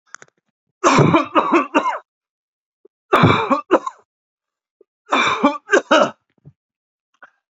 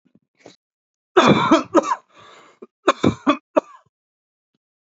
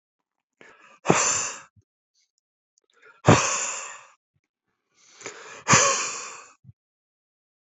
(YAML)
three_cough_length: 7.6 s
three_cough_amplitude: 32207
three_cough_signal_mean_std_ratio: 0.42
cough_length: 4.9 s
cough_amplitude: 32767
cough_signal_mean_std_ratio: 0.33
exhalation_length: 7.8 s
exhalation_amplitude: 27166
exhalation_signal_mean_std_ratio: 0.32
survey_phase: alpha (2021-03-01 to 2021-08-12)
age: 45-64
gender: Male
wearing_mask: 'No'
symptom_none: true
smoker_status: Ex-smoker
respiratory_condition_asthma: false
respiratory_condition_other: false
recruitment_source: Test and Trace
submission_delay: 2 days
covid_test_result: Positive
covid_test_method: RT-qPCR
covid_ct_value: 31.6
covid_ct_gene: N gene